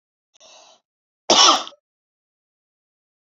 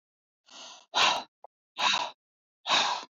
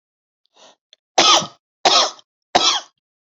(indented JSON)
{
  "cough_length": "3.2 s",
  "cough_amplitude": 32768,
  "cough_signal_mean_std_ratio": 0.25,
  "exhalation_length": "3.2 s",
  "exhalation_amplitude": 10768,
  "exhalation_signal_mean_std_ratio": 0.44,
  "three_cough_length": "3.3 s",
  "three_cough_amplitude": 31865,
  "three_cough_signal_mean_std_ratio": 0.38,
  "survey_phase": "beta (2021-08-13 to 2022-03-07)",
  "age": "18-44",
  "gender": "Female",
  "wearing_mask": "No",
  "symptom_headache": true,
  "smoker_status": "Never smoked",
  "respiratory_condition_asthma": false,
  "respiratory_condition_other": false,
  "recruitment_source": "REACT",
  "submission_delay": "2 days",
  "covid_test_result": "Negative",
  "covid_test_method": "RT-qPCR"
}